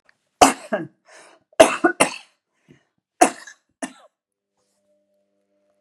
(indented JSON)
{
  "three_cough_length": "5.8 s",
  "three_cough_amplitude": 32768,
  "three_cough_signal_mean_std_ratio": 0.23,
  "survey_phase": "beta (2021-08-13 to 2022-03-07)",
  "age": "65+",
  "gender": "Female",
  "wearing_mask": "No",
  "symptom_none": true,
  "smoker_status": "Ex-smoker",
  "respiratory_condition_asthma": false,
  "respiratory_condition_other": false,
  "recruitment_source": "REACT",
  "submission_delay": "1 day",
  "covid_test_result": "Negative",
  "covid_test_method": "RT-qPCR",
  "influenza_a_test_result": "Negative",
  "influenza_b_test_result": "Negative"
}